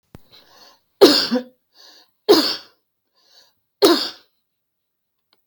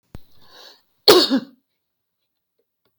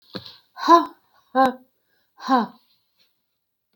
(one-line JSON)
{"three_cough_length": "5.5 s", "three_cough_amplitude": 32768, "three_cough_signal_mean_std_ratio": 0.3, "cough_length": "3.0 s", "cough_amplitude": 32768, "cough_signal_mean_std_ratio": 0.26, "exhalation_length": "3.8 s", "exhalation_amplitude": 26945, "exhalation_signal_mean_std_ratio": 0.3, "survey_phase": "beta (2021-08-13 to 2022-03-07)", "age": "65+", "gender": "Female", "wearing_mask": "No", "symptom_none": true, "smoker_status": "Never smoked", "respiratory_condition_asthma": false, "respiratory_condition_other": false, "recruitment_source": "REACT", "submission_delay": "2 days", "covid_test_result": "Negative", "covid_test_method": "RT-qPCR"}